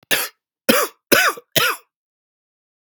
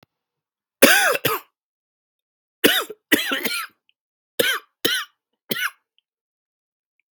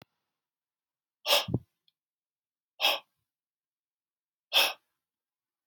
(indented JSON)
{
  "cough_length": "2.9 s",
  "cough_amplitude": 32768,
  "cough_signal_mean_std_ratio": 0.39,
  "three_cough_length": "7.2 s",
  "three_cough_amplitude": 32768,
  "three_cough_signal_mean_std_ratio": 0.34,
  "exhalation_length": "5.7 s",
  "exhalation_amplitude": 10678,
  "exhalation_signal_mean_std_ratio": 0.25,
  "survey_phase": "beta (2021-08-13 to 2022-03-07)",
  "age": "18-44",
  "gender": "Male",
  "wearing_mask": "No",
  "symptom_runny_or_blocked_nose": true,
  "symptom_sore_throat": true,
  "symptom_fatigue": true,
  "symptom_fever_high_temperature": true,
  "symptom_headache": true,
  "symptom_onset": "3 days",
  "smoker_status": "Never smoked",
  "respiratory_condition_asthma": false,
  "respiratory_condition_other": false,
  "recruitment_source": "Test and Trace",
  "submission_delay": "1 day",
  "covid_test_result": "Positive",
  "covid_test_method": "RT-qPCR",
  "covid_ct_value": 18.8,
  "covid_ct_gene": "ORF1ab gene",
  "covid_ct_mean": 19.0,
  "covid_viral_load": "590000 copies/ml",
  "covid_viral_load_category": "Low viral load (10K-1M copies/ml)"
}